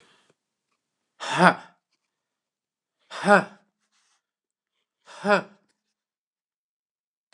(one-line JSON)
{"exhalation_length": "7.3 s", "exhalation_amplitude": 28989, "exhalation_signal_mean_std_ratio": 0.21, "survey_phase": "beta (2021-08-13 to 2022-03-07)", "age": "65+", "gender": "Male", "wearing_mask": "No", "symptom_fatigue": true, "smoker_status": "Never smoked", "respiratory_condition_asthma": false, "respiratory_condition_other": false, "recruitment_source": "REACT", "submission_delay": "3 days", "covid_test_result": "Negative", "covid_test_method": "RT-qPCR", "influenza_a_test_result": "Unknown/Void", "influenza_b_test_result": "Unknown/Void"}